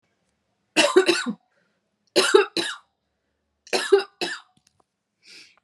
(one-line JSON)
{"three_cough_length": "5.6 s", "three_cough_amplitude": 28997, "three_cough_signal_mean_std_ratio": 0.35, "survey_phase": "beta (2021-08-13 to 2022-03-07)", "age": "18-44", "gender": "Female", "wearing_mask": "No", "symptom_cough_any": true, "symptom_runny_or_blocked_nose": true, "symptom_sore_throat": true, "symptom_headache": true, "symptom_onset": "3 days", "smoker_status": "Never smoked", "respiratory_condition_asthma": false, "respiratory_condition_other": false, "recruitment_source": "Test and Trace", "submission_delay": "1 day", "covid_test_result": "Positive", "covid_test_method": "RT-qPCR", "covid_ct_value": 27.7, "covid_ct_gene": "N gene"}